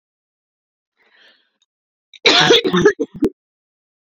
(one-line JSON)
{"cough_length": "4.1 s", "cough_amplitude": 30772, "cough_signal_mean_std_ratio": 0.34, "survey_phase": "beta (2021-08-13 to 2022-03-07)", "age": "18-44", "gender": "Female", "wearing_mask": "No", "symptom_cough_any": true, "symptom_runny_or_blocked_nose": true, "symptom_shortness_of_breath": true, "symptom_abdominal_pain": true, "symptom_diarrhoea": true, "symptom_fatigue": true, "symptom_fever_high_temperature": true, "symptom_other": true, "smoker_status": "Current smoker (1 to 10 cigarettes per day)", "respiratory_condition_asthma": true, "respiratory_condition_other": false, "recruitment_source": "Test and Trace", "submission_delay": "2 days", "covid_test_result": "Positive", "covid_test_method": "RT-qPCR", "covid_ct_value": 25.0, "covid_ct_gene": "N gene"}